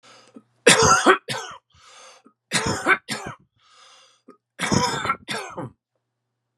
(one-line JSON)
{"three_cough_length": "6.6 s", "three_cough_amplitude": 31353, "three_cough_signal_mean_std_ratio": 0.39, "survey_phase": "beta (2021-08-13 to 2022-03-07)", "age": "45-64", "gender": "Male", "wearing_mask": "No", "symptom_none": true, "smoker_status": "Never smoked", "respiratory_condition_asthma": false, "respiratory_condition_other": false, "recruitment_source": "REACT", "submission_delay": "2 days", "covid_test_result": "Negative", "covid_test_method": "RT-qPCR", "influenza_a_test_result": "Negative", "influenza_b_test_result": "Negative"}